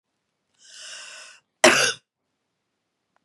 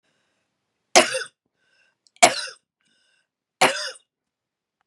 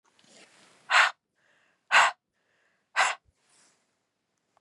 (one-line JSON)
{"cough_length": "3.2 s", "cough_amplitude": 32767, "cough_signal_mean_std_ratio": 0.24, "three_cough_length": "4.9 s", "three_cough_amplitude": 32768, "three_cough_signal_mean_std_ratio": 0.23, "exhalation_length": "4.6 s", "exhalation_amplitude": 14634, "exhalation_signal_mean_std_ratio": 0.27, "survey_phase": "beta (2021-08-13 to 2022-03-07)", "age": "45-64", "gender": "Female", "wearing_mask": "No", "symptom_cough_any": true, "symptom_fatigue": true, "symptom_headache": true, "symptom_other": true, "symptom_onset": "3 days", "smoker_status": "Ex-smoker", "respiratory_condition_asthma": false, "respiratory_condition_other": false, "recruitment_source": "Test and Trace", "submission_delay": "2 days", "covid_test_result": "Positive", "covid_test_method": "RT-qPCR", "covid_ct_value": 20.6, "covid_ct_gene": "ORF1ab gene", "covid_ct_mean": 21.1, "covid_viral_load": "120000 copies/ml", "covid_viral_load_category": "Low viral load (10K-1M copies/ml)"}